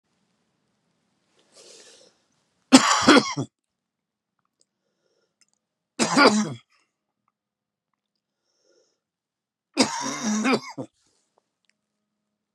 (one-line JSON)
{"three_cough_length": "12.5 s", "three_cough_amplitude": 32767, "three_cough_signal_mean_std_ratio": 0.27, "survey_phase": "beta (2021-08-13 to 2022-03-07)", "age": "45-64", "gender": "Male", "wearing_mask": "No", "symptom_cough_any": true, "symptom_shortness_of_breath": true, "symptom_sore_throat": true, "symptom_fatigue": true, "symptom_headache": true, "smoker_status": "Never smoked", "respiratory_condition_asthma": false, "respiratory_condition_other": false, "recruitment_source": "Test and Trace", "submission_delay": "1 day", "covid_test_result": "Positive", "covid_test_method": "LFT"}